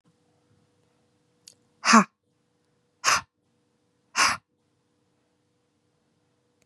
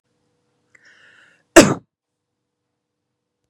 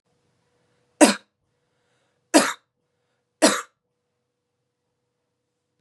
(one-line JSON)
{"exhalation_length": "6.7 s", "exhalation_amplitude": 24697, "exhalation_signal_mean_std_ratio": 0.21, "cough_length": "3.5 s", "cough_amplitude": 32768, "cough_signal_mean_std_ratio": 0.16, "three_cough_length": "5.8 s", "three_cough_amplitude": 32111, "three_cough_signal_mean_std_ratio": 0.2, "survey_phase": "beta (2021-08-13 to 2022-03-07)", "age": "18-44", "gender": "Female", "wearing_mask": "No", "symptom_runny_or_blocked_nose": true, "symptom_fatigue": true, "symptom_headache": true, "symptom_other": true, "symptom_onset": "2 days", "smoker_status": "Current smoker (e-cigarettes or vapes only)", "respiratory_condition_asthma": false, "respiratory_condition_other": false, "recruitment_source": "Test and Trace", "submission_delay": "2 days", "covid_test_result": "Positive", "covid_test_method": "RT-qPCR", "covid_ct_value": 26.6, "covid_ct_gene": "N gene"}